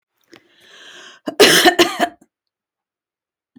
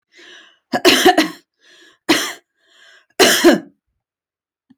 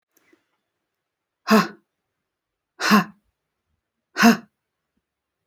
{
  "cough_length": "3.6 s",
  "cough_amplitude": 32768,
  "cough_signal_mean_std_ratio": 0.32,
  "three_cough_length": "4.8 s",
  "three_cough_amplitude": 30882,
  "three_cough_signal_mean_std_ratio": 0.37,
  "exhalation_length": "5.5 s",
  "exhalation_amplitude": 28814,
  "exhalation_signal_mean_std_ratio": 0.25,
  "survey_phase": "beta (2021-08-13 to 2022-03-07)",
  "age": "45-64",
  "gender": "Female",
  "wearing_mask": "No",
  "symptom_none": true,
  "symptom_onset": "12 days",
  "smoker_status": "Ex-smoker",
  "respiratory_condition_asthma": false,
  "respiratory_condition_other": false,
  "recruitment_source": "REACT",
  "submission_delay": "3 days",
  "covid_test_result": "Negative",
  "covid_test_method": "RT-qPCR",
  "influenza_a_test_result": "Negative",
  "influenza_b_test_result": "Negative"
}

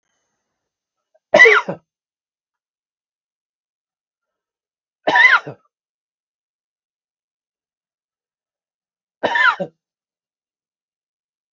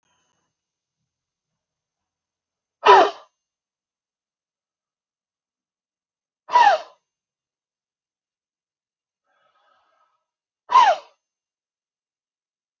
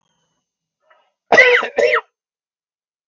{
  "three_cough_length": "11.5 s",
  "three_cough_amplitude": 32768,
  "three_cough_signal_mean_std_ratio": 0.22,
  "exhalation_length": "12.8 s",
  "exhalation_amplitude": 32733,
  "exhalation_signal_mean_std_ratio": 0.19,
  "cough_length": "3.1 s",
  "cough_amplitude": 32768,
  "cough_signal_mean_std_ratio": 0.34,
  "survey_phase": "beta (2021-08-13 to 2022-03-07)",
  "age": "45-64",
  "gender": "Male",
  "wearing_mask": "No",
  "symptom_cough_any": true,
  "symptom_shortness_of_breath": true,
  "symptom_fatigue": true,
  "smoker_status": "Never smoked",
  "respiratory_condition_asthma": true,
  "respiratory_condition_other": false,
  "recruitment_source": "REACT",
  "submission_delay": "1 day",
  "covid_test_result": "Negative",
  "covid_test_method": "RT-qPCR"
}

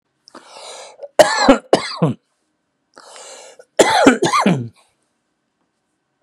{
  "cough_length": "6.2 s",
  "cough_amplitude": 32768,
  "cough_signal_mean_std_ratio": 0.37,
  "survey_phase": "beta (2021-08-13 to 2022-03-07)",
  "age": "45-64",
  "gender": "Male",
  "wearing_mask": "No",
  "symptom_none": true,
  "smoker_status": "Ex-smoker",
  "respiratory_condition_asthma": false,
  "respiratory_condition_other": false,
  "recruitment_source": "REACT",
  "submission_delay": "1 day",
  "covid_test_result": "Negative",
  "covid_test_method": "RT-qPCR",
  "influenza_a_test_result": "Unknown/Void",
  "influenza_b_test_result": "Unknown/Void"
}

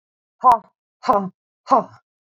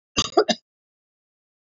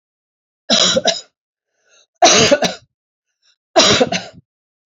{
  "exhalation_length": "2.3 s",
  "exhalation_amplitude": 28020,
  "exhalation_signal_mean_std_ratio": 0.34,
  "cough_length": "1.7 s",
  "cough_amplitude": 21356,
  "cough_signal_mean_std_ratio": 0.25,
  "three_cough_length": "4.9 s",
  "three_cough_amplitude": 32767,
  "three_cough_signal_mean_std_ratio": 0.42,
  "survey_phase": "beta (2021-08-13 to 2022-03-07)",
  "age": "45-64",
  "gender": "Female",
  "wearing_mask": "No",
  "symptom_none": true,
  "smoker_status": "Never smoked",
  "respiratory_condition_asthma": false,
  "respiratory_condition_other": false,
  "recruitment_source": "REACT",
  "submission_delay": "2 days",
  "covid_test_result": "Negative",
  "covid_test_method": "RT-qPCR"
}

